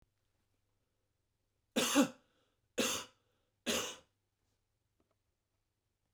{"three_cough_length": "6.1 s", "three_cough_amplitude": 5339, "three_cough_signal_mean_std_ratio": 0.27, "survey_phase": "beta (2021-08-13 to 2022-03-07)", "age": "65+", "gender": "Male", "wearing_mask": "No", "symptom_cough_any": true, "symptom_runny_or_blocked_nose": true, "symptom_onset": "12 days", "smoker_status": "Never smoked", "respiratory_condition_asthma": false, "respiratory_condition_other": false, "recruitment_source": "REACT", "submission_delay": "3 days", "covid_test_result": "Negative", "covid_test_method": "RT-qPCR", "influenza_a_test_result": "Negative", "influenza_b_test_result": "Negative"}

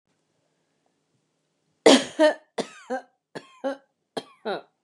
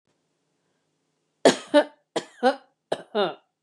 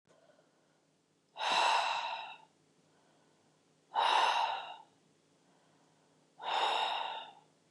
{"three_cough_length": "4.8 s", "three_cough_amplitude": 31068, "three_cough_signal_mean_std_ratio": 0.26, "cough_length": "3.6 s", "cough_amplitude": 24210, "cough_signal_mean_std_ratio": 0.28, "exhalation_length": "7.7 s", "exhalation_amplitude": 4382, "exhalation_signal_mean_std_ratio": 0.47, "survey_phase": "beta (2021-08-13 to 2022-03-07)", "age": "65+", "gender": "Female", "wearing_mask": "No", "symptom_none": true, "smoker_status": "Ex-smoker", "respiratory_condition_asthma": false, "respiratory_condition_other": false, "recruitment_source": "REACT", "submission_delay": "2 days", "covid_test_result": "Negative", "covid_test_method": "RT-qPCR"}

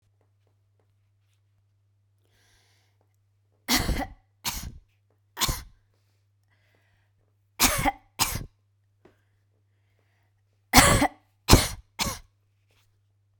{"three_cough_length": "13.4 s", "three_cough_amplitude": 32768, "three_cough_signal_mean_std_ratio": 0.26, "survey_phase": "beta (2021-08-13 to 2022-03-07)", "age": "45-64", "gender": "Female", "wearing_mask": "No", "symptom_none": true, "smoker_status": "Never smoked", "respiratory_condition_asthma": false, "respiratory_condition_other": false, "recruitment_source": "REACT", "submission_delay": "7 days", "covid_test_result": "Negative", "covid_test_method": "RT-qPCR"}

